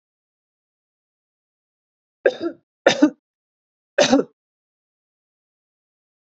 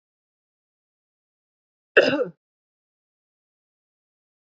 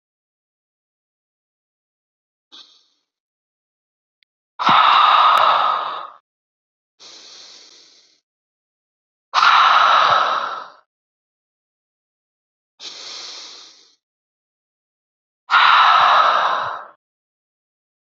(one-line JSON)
{"three_cough_length": "6.2 s", "three_cough_amplitude": 27681, "three_cough_signal_mean_std_ratio": 0.22, "cough_length": "4.4 s", "cough_amplitude": 27312, "cough_signal_mean_std_ratio": 0.17, "exhalation_length": "18.2 s", "exhalation_amplitude": 28071, "exhalation_signal_mean_std_ratio": 0.38, "survey_phase": "beta (2021-08-13 to 2022-03-07)", "age": "18-44", "gender": "Female", "wearing_mask": "No", "symptom_none": true, "smoker_status": "Current smoker (1 to 10 cigarettes per day)", "respiratory_condition_asthma": false, "respiratory_condition_other": false, "recruitment_source": "REACT", "submission_delay": "1 day", "covid_test_result": "Negative", "covid_test_method": "RT-qPCR", "influenza_a_test_result": "Unknown/Void", "influenza_b_test_result": "Unknown/Void"}